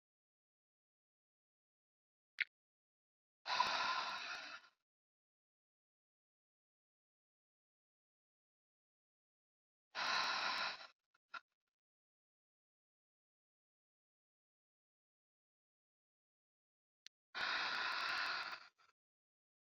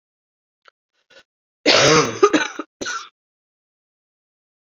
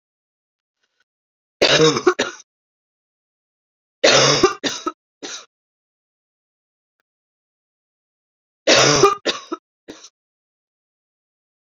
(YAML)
exhalation_length: 19.8 s
exhalation_amplitude: 3200
exhalation_signal_mean_std_ratio: 0.31
cough_length: 4.8 s
cough_amplitude: 29830
cough_signal_mean_std_ratio: 0.32
three_cough_length: 11.7 s
three_cough_amplitude: 32767
three_cough_signal_mean_std_ratio: 0.3
survey_phase: beta (2021-08-13 to 2022-03-07)
age: 45-64
gender: Female
wearing_mask: 'No'
symptom_cough_any: true
symptom_runny_or_blocked_nose: true
symptom_fatigue: true
symptom_headache: true
symptom_change_to_sense_of_smell_or_taste: true
symptom_other: true
symptom_onset: 3 days
smoker_status: Never smoked
respiratory_condition_asthma: false
respiratory_condition_other: false
recruitment_source: Test and Trace
submission_delay: 1 day
covid_test_result: Positive
covid_test_method: RT-qPCR
covid_ct_value: 16.3
covid_ct_gene: ORF1ab gene
covid_ct_mean: 16.7
covid_viral_load: 3400000 copies/ml
covid_viral_load_category: High viral load (>1M copies/ml)